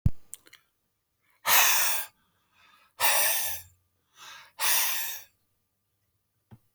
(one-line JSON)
{"exhalation_length": "6.7 s", "exhalation_amplitude": 14894, "exhalation_signal_mean_std_ratio": 0.43, "survey_phase": "beta (2021-08-13 to 2022-03-07)", "age": "45-64", "gender": "Male", "wearing_mask": "No", "symptom_runny_or_blocked_nose": true, "smoker_status": "Never smoked", "respiratory_condition_asthma": false, "respiratory_condition_other": false, "recruitment_source": "REACT", "submission_delay": "1 day", "covid_test_result": "Negative", "covid_test_method": "RT-qPCR"}